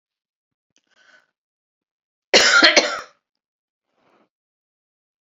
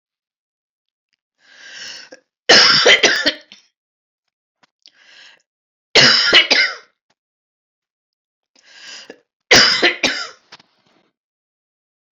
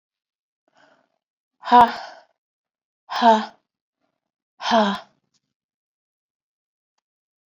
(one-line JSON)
{"cough_length": "5.2 s", "cough_amplitude": 32768, "cough_signal_mean_std_ratio": 0.26, "three_cough_length": "12.1 s", "three_cough_amplitude": 32767, "three_cough_signal_mean_std_ratio": 0.34, "exhalation_length": "7.5 s", "exhalation_amplitude": 28454, "exhalation_signal_mean_std_ratio": 0.24, "survey_phase": "beta (2021-08-13 to 2022-03-07)", "age": "45-64", "gender": "Female", "wearing_mask": "No", "symptom_cough_any": true, "symptom_onset": "5 days", "smoker_status": "Never smoked", "respiratory_condition_asthma": false, "respiratory_condition_other": false, "recruitment_source": "Test and Trace", "submission_delay": "2 days", "covid_test_result": "Positive", "covid_test_method": "RT-qPCR", "covid_ct_value": 18.1, "covid_ct_gene": "ORF1ab gene"}